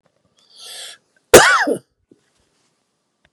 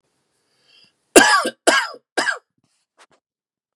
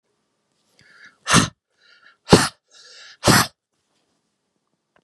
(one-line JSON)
{"cough_length": "3.3 s", "cough_amplitude": 32768, "cough_signal_mean_std_ratio": 0.27, "three_cough_length": "3.8 s", "three_cough_amplitude": 32768, "three_cough_signal_mean_std_ratio": 0.31, "exhalation_length": "5.0 s", "exhalation_amplitude": 32768, "exhalation_signal_mean_std_ratio": 0.25, "survey_phase": "beta (2021-08-13 to 2022-03-07)", "age": "45-64", "gender": "Male", "wearing_mask": "Yes", "symptom_cough_any": true, "symptom_runny_or_blocked_nose": true, "symptom_shortness_of_breath": true, "symptom_fatigue": true, "symptom_fever_high_temperature": true, "symptom_headache": true, "symptom_change_to_sense_of_smell_or_taste": true, "symptom_loss_of_taste": true, "symptom_onset": "4 days", "smoker_status": "Ex-smoker", "respiratory_condition_asthma": false, "respiratory_condition_other": false, "recruitment_source": "Test and Trace", "submission_delay": "2 days", "covid_test_result": "Positive", "covid_test_method": "RT-qPCR", "covid_ct_value": 16.3, "covid_ct_gene": "ORF1ab gene", "covid_ct_mean": 16.8, "covid_viral_load": "3100000 copies/ml", "covid_viral_load_category": "High viral load (>1M copies/ml)"}